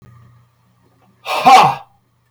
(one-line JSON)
{"exhalation_length": "2.3 s", "exhalation_amplitude": 32768, "exhalation_signal_mean_std_ratio": 0.35, "survey_phase": "beta (2021-08-13 to 2022-03-07)", "age": "45-64", "gender": "Male", "wearing_mask": "No", "symptom_cough_any": true, "smoker_status": "Current smoker (1 to 10 cigarettes per day)", "respiratory_condition_asthma": false, "respiratory_condition_other": false, "recruitment_source": "REACT", "submission_delay": "5 days", "covid_test_result": "Negative", "covid_test_method": "RT-qPCR", "influenza_a_test_result": "Negative", "influenza_b_test_result": "Negative"}